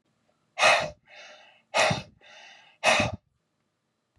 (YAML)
exhalation_length: 4.2 s
exhalation_amplitude: 15411
exhalation_signal_mean_std_ratio: 0.37
survey_phase: beta (2021-08-13 to 2022-03-07)
age: 45-64
gender: Male
wearing_mask: 'No'
symptom_none: true
smoker_status: Never smoked
respiratory_condition_asthma: false
respiratory_condition_other: false
recruitment_source: REACT
submission_delay: 1 day
covid_test_result: Negative
covid_test_method: RT-qPCR